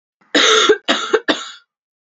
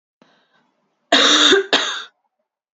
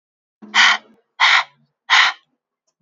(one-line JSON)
{"three_cough_length": "2.0 s", "three_cough_amplitude": 31475, "three_cough_signal_mean_std_ratio": 0.52, "cough_length": "2.7 s", "cough_amplitude": 32003, "cough_signal_mean_std_ratio": 0.43, "exhalation_length": "2.8 s", "exhalation_amplitude": 29751, "exhalation_signal_mean_std_ratio": 0.41, "survey_phase": "beta (2021-08-13 to 2022-03-07)", "age": "18-44", "gender": "Female", "wearing_mask": "No", "symptom_cough_any": true, "symptom_runny_or_blocked_nose": true, "symptom_shortness_of_breath": true, "symptom_sore_throat": true, "symptom_fatigue": true, "symptom_fever_high_temperature": true, "symptom_headache": true, "symptom_change_to_sense_of_smell_or_taste": true, "symptom_onset": "3 days", "smoker_status": "Ex-smoker", "respiratory_condition_asthma": false, "respiratory_condition_other": false, "recruitment_source": "Test and Trace", "submission_delay": "1 day", "covid_test_result": "Positive", "covid_test_method": "RT-qPCR", "covid_ct_value": 19.9, "covid_ct_gene": "N gene", "covid_ct_mean": 20.1, "covid_viral_load": "250000 copies/ml", "covid_viral_load_category": "Low viral load (10K-1M copies/ml)"}